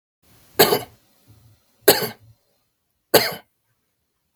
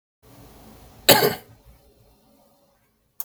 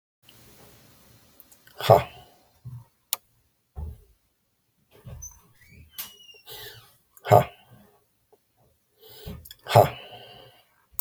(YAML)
three_cough_length: 4.4 s
three_cough_amplitude: 32768
three_cough_signal_mean_std_ratio: 0.26
cough_length: 3.2 s
cough_amplitude: 32768
cough_signal_mean_std_ratio: 0.23
exhalation_length: 11.0 s
exhalation_amplitude: 26796
exhalation_signal_mean_std_ratio: 0.21
survey_phase: beta (2021-08-13 to 2022-03-07)
age: 45-64
gender: Male
wearing_mask: 'No'
symptom_none: true
smoker_status: Never smoked
respiratory_condition_asthma: false
respiratory_condition_other: false
recruitment_source: REACT
submission_delay: 2 days
covid_test_result: Negative
covid_test_method: RT-qPCR